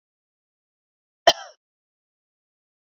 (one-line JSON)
{"cough_length": "2.8 s", "cough_amplitude": 32767, "cough_signal_mean_std_ratio": 0.11, "survey_phase": "beta (2021-08-13 to 2022-03-07)", "age": "45-64", "gender": "Female", "wearing_mask": "No", "symptom_none": true, "smoker_status": "Never smoked", "respiratory_condition_asthma": true, "respiratory_condition_other": false, "recruitment_source": "REACT", "submission_delay": "1 day", "covid_test_result": "Negative", "covid_test_method": "RT-qPCR", "influenza_a_test_result": "Negative", "influenza_b_test_result": "Negative"}